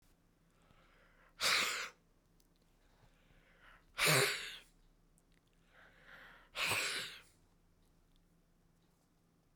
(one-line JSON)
{"exhalation_length": "9.6 s", "exhalation_amplitude": 3904, "exhalation_signal_mean_std_ratio": 0.33, "survey_phase": "beta (2021-08-13 to 2022-03-07)", "age": "45-64", "gender": "Male", "wearing_mask": "No", "symptom_none": true, "smoker_status": "Never smoked", "respiratory_condition_asthma": false, "respiratory_condition_other": true, "recruitment_source": "REACT", "submission_delay": "3 days", "covid_test_result": "Negative", "covid_test_method": "RT-qPCR"}